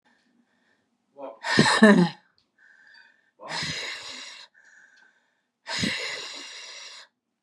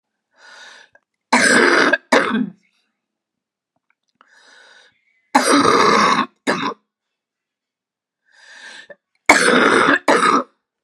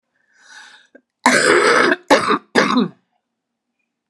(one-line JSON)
{"exhalation_length": "7.4 s", "exhalation_amplitude": 29666, "exhalation_signal_mean_std_ratio": 0.33, "three_cough_length": "10.8 s", "three_cough_amplitude": 32768, "three_cough_signal_mean_std_ratio": 0.45, "cough_length": "4.1 s", "cough_amplitude": 32767, "cough_signal_mean_std_ratio": 0.47, "survey_phase": "beta (2021-08-13 to 2022-03-07)", "age": "45-64", "gender": "Female", "wearing_mask": "No", "symptom_cough_any": true, "symptom_runny_or_blocked_nose": true, "symptom_sore_throat": true, "symptom_fatigue": true, "symptom_headache": true, "symptom_change_to_sense_of_smell_or_taste": true, "smoker_status": "Never smoked", "respiratory_condition_asthma": true, "respiratory_condition_other": false, "recruitment_source": "Test and Trace", "submission_delay": "2 days", "covid_test_result": "Positive", "covid_test_method": "RT-qPCR", "covid_ct_value": 33.1, "covid_ct_gene": "ORF1ab gene", "covid_ct_mean": 33.3, "covid_viral_load": "12 copies/ml", "covid_viral_load_category": "Minimal viral load (< 10K copies/ml)"}